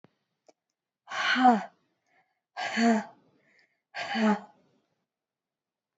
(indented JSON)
{
  "exhalation_length": "6.0 s",
  "exhalation_amplitude": 12957,
  "exhalation_signal_mean_std_ratio": 0.36,
  "survey_phase": "beta (2021-08-13 to 2022-03-07)",
  "age": "45-64",
  "gender": "Female",
  "wearing_mask": "No",
  "symptom_cough_any": true,
  "symptom_diarrhoea": true,
  "symptom_fatigue": true,
  "symptom_fever_high_temperature": true,
  "symptom_headache": true,
  "symptom_onset": "4 days",
  "smoker_status": "Never smoked",
  "respiratory_condition_asthma": false,
  "respiratory_condition_other": false,
  "recruitment_source": "Test and Trace",
  "submission_delay": "1 day",
  "covid_test_result": "Positive",
  "covid_test_method": "RT-qPCR",
  "covid_ct_value": 16.4,
  "covid_ct_gene": "ORF1ab gene"
}